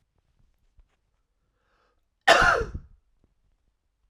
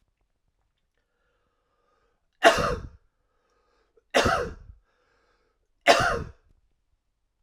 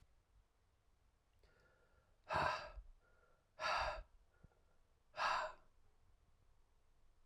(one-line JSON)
{"cough_length": "4.1 s", "cough_amplitude": 21972, "cough_signal_mean_std_ratio": 0.24, "three_cough_length": "7.4 s", "three_cough_amplitude": 27548, "three_cough_signal_mean_std_ratio": 0.27, "exhalation_length": "7.3 s", "exhalation_amplitude": 2075, "exhalation_signal_mean_std_ratio": 0.37, "survey_phase": "alpha (2021-03-01 to 2021-08-12)", "age": "18-44", "gender": "Male", "wearing_mask": "No", "symptom_cough_any": true, "symptom_change_to_sense_of_smell_or_taste": true, "symptom_loss_of_taste": true, "symptom_onset": "8 days", "smoker_status": "Never smoked", "respiratory_condition_asthma": false, "respiratory_condition_other": false, "recruitment_source": "Test and Trace", "submission_delay": "2 days", "covid_test_result": "Positive", "covid_test_method": "RT-qPCR", "covid_ct_value": 16.3, "covid_ct_gene": "N gene", "covid_ct_mean": 16.7, "covid_viral_load": "3400000 copies/ml", "covid_viral_load_category": "High viral load (>1M copies/ml)"}